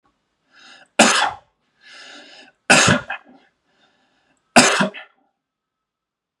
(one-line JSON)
{"three_cough_length": "6.4 s", "three_cough_amplitude": 32768, "three_cough_signal_mean_std_ratio": 0.31, "survey_phase": "beta (2021-08-13 to 2022-03-07)", "age": "18-44", "gender": "Male", "wearing_mask": "No", "symptom_none": true, "smoker_status": "Never smoked", "respiratory_condition_asthma": false, "respiratory_condition_other": false, "recruitment_source": "REACT", "submission_delay": "1 day", "covid_test_result": "Negative", "covid_test_method": "RT-qPCR", "influenza_a_test_result": "Negative", "influenza_b_test_result": "Negative"}